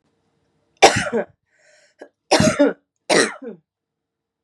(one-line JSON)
{"three_cough_length": "4.4 s", "three_cough_amplitude": 32768, "three_cough_signal_mean_std_ratio": 0.34, "survey_phase": "beta (2021-08-13 to 2022-03-07)", "age": "18-44", "gender": "Female", "wearing_mask": "No", "symptom_cough_any": true, "symptom_new_continuous_cough": true, "symptom_runny_or_blocked_nose": true, "symptom_shortness_of_breath": true, "symptom_sore_throat": true, "symptom_abdominal_pain": true, "symptom_fatigue": true, "symptom_headache": true, "smoker_status": "Ex-smoker", "respiratory_condition_asthma": true, "respiratory_condition_other": false, "recruitment_source": "REACT", "submission_delay": "4 days", "covid_test_result": "Negative", "covid_test_method": "RT-qPCR", "influenza_a_test_result": "Negative", "influenza_b_test_result": "Negative"}